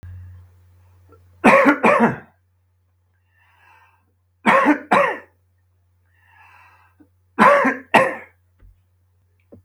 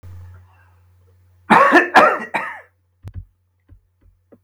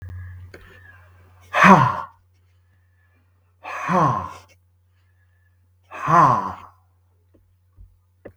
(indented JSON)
{
  "three_cough_length": "9.6 s",
  "three_cough_amplitude": 32766,
  "three_cough_signal_mean_std_ratio": 0.35,
  "cough_length": "4.4 s",
  "cough_amplitude": 32768,
  "cough_signal_mean_std_ratio": 0.34,
  "exhalation_length": "8.4 s",
  "exhalation_amplitude": 32768,
  "exhalation_signal_mean_std_ratio": 0.33,
  "survey_phase": "beta (2021-08-13 to 2022-03-07)",
  "age": "65+",
  "gender": "Male",
  "wearing_mask": "No",
  "symptom_cough_any": true,
  "symptom_runny_or_blocked_nose": true,
  "symptom_onset": "2 days",
  "smoker_status": "Ex-smoker",
  "respiratory_condition_asthma": false,
  "respiratory_condition_other": false,
  "recruitment_source": "REACT",
  "submission_delay": "2 days",
  "covid_test_result": "Negative",
  "covid_test_method": "RT-qPCR"
}